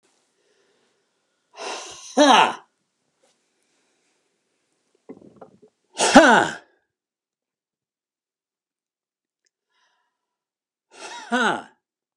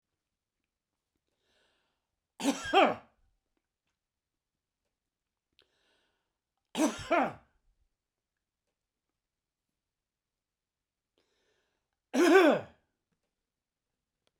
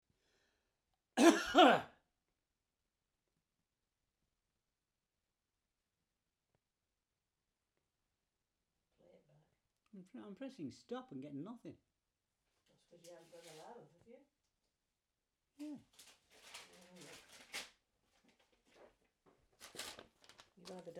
{
  "exhalation_length": "12.2 s",
  "exhalation_amplitude": 32768,
  "exhalation_signal_mean_std_ratio": 0.23,
  "three_cough_length": "14.4 s",
  "three_cough_amplitude": 8788,
  "three_cough_signal_mean_std_ratio": 0.23,
  "cough_length": "21.0 s",
  "cough_amplitude": 7152,
  "cough_signal_mean_std_ratio": 0.18,
  "survey_phase": "beta (2021-08-13 to 2022-03-07)",
  "age": "65+",
  "gender": "Male",
  "wearing_mask": "No",
  "symptom_none": true,
  "smoker_status": "Never smoked",
  "respiratory_condition_asthma": true,
  "respiratory_condition_other": false,
  "recruitment_source": "REACT",
  "submission_delay": "2 days",
  "covid_test_result": "Negative",
  "covid_test_method": "RT-qPCR",
  "influenza_a_test_result": "Negative",
  "influenza_b_test_result": "Negative"
}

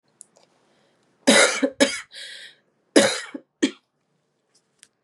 {
  "cough_length": "5.0 s",
  "cough_amplitude": 31864,
  "cough_signal_mean_std_ratio": 0.32,
  "survey_phase": "beta (2021-08-13 to 2022-03-07)",
  "age": "18-44",
  "gender": "Female",
  "wearing_mask": "No",
  "symptom_cough_any": true,
  "symptom_new_continuous_cough": true,
  "symptom_runny_or_blocked_nose": true,
  "symptom_shortness_of_breath": true,
  "symptom_abdominal_pain": true,
  "symptom_fatigue": true,
  "symptom_fever_high_temperature": true,
  "symptom_headache": true,
  "symptom_onset": "5 days",
  "smoker_status": "Never smoked",
  "respiratory_condition_asthma": false,
  "respiratory_condition_other": false,
  "recruitment_source": "Test and Trace",
  "submission_delay": "2 days",
  "covid_test_result": "Positive",
  "covid_test_method": "RT-qPCR",
  "covid_ct_value": 11.4,
  "covid_ct_gene": "ORF1ab gene"
}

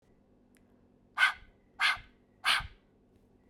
{
  "exhalation_length": "3.5 s",
  "exhalation_amplitude": 8375,
  "exhalation_signal_mean_std_ratio": 0.32,
  "survey_phase": "beta (2021-08-13 to 2022-03-07)",
  "age": "18-44",
  "gender": "Female",
  "wearing_mask": "No",
  "symptom_cough_any": true,
  "symptom_new_continuous_cough": true,
  "symptom_runny_or_blocked_nose": true,
  "symptom_other": true,
  "symptom_onset": "3 days",
  "smoker_status": "Never smoked",
  "respiratory_condition_asthma": true,
  "respiratory_condition_other": false,
  "recruitment_source": "Test and Trace",
  "submission_delay": "1 day",
  "covid_test_result": "Positive",
  "covid_test_method": "RT-qPCR",
  "covid_ct_value": 31.5,
  "covid_ct_gene": "N gene"
}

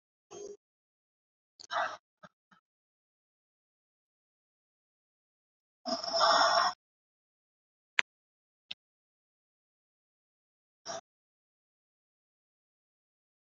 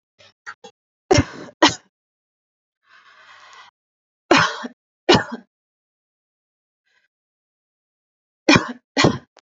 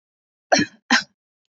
{
  "exhalation_length": "13.5 s",
  "exhalation_amplitude": 22546,
  "exhalation_signal_mean_std_ratio": 0.21,
  "three_cough_length": "9.6 s",
  "three_cough_amplitude": 32768,
  "three_cough_signal_mean_std_ratio": 0.25,
  "cough_length": "1.5 s",
  "cough_amplitude": 23958,
  "cough_signal_mean_std_ratio": 0.31,
  "survey_phase": "beta (2021-08-13 to 2022-03-07)",
  "age": "18-44",
  "gender": "Female",
  "wearing_mask": "No",
  "symptom_none": true,
  "smoker_status": "Never smoked",
  "respiratory_condition_asthma": false,
  "respiratory_condition_other": false,
  "recruitment_source": "REACT",
  "submission_delay": "1 day",
  "covid_test_result": "Negative",
  "covid_test_method": "RT-qPCR",
  "influenza_a_test_result": "Negative",
  "influenza_b_test_result": "Negative"
}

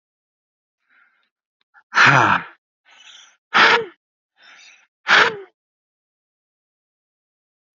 {
  "exhalation_length": "7.8 s",
  "exhalation_amplitude": 30577,
  "exhalation_signal_mean_std_ratio": 0.29,
  "survey_phase": "alpha (2021-03-01 to 2021-08-12)",
  "age": "45-64",
  "gender": "Male",
  "wearing_mask": "No",
  "symptom_none": true,
  "smoker_status": "Ex-smoker",
  "respiratory_condition_asthma": false,
  "respiratory_condition_other": false,
  "recruitment_source": "REACT",
  "submission_delay": "4 days",
  "covid_test_result": "Negative",
  "covid_test_method": "RT-qPCR"
}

